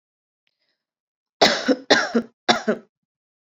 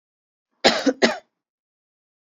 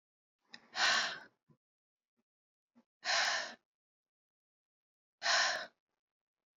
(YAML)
three_cough_length: 3.5 s
three_cough_amplitude: 31482
three_cough_signal_mean_std_ratio: 0.34
cough_length: 2.3 s
cough_amplitude: 30974
cough_signal_mean_std_ratio: 0.29
exhalation_length: 6.6 s
exhalation_amplitude: 3544
exhalation_signal_mean_std_ratio: 0.35
survey_phase: beta (2021-08-13 to 2022-03-07)
age: 18-44
gender: Female
wearing_mask: 'No'
symptom_cough_any: true
symptom_runny_or_blocked_nose: true
symptom_headache: true
symptom_onset: 5 days
smoker_status: Never smoked
respiratory_condition_asthma: false
respiratory_condition_other: false
recruitment_source: Test and Trace
submission_delay: 2 days
covid_test_result: Positive
covid_test_method: RT-qPCR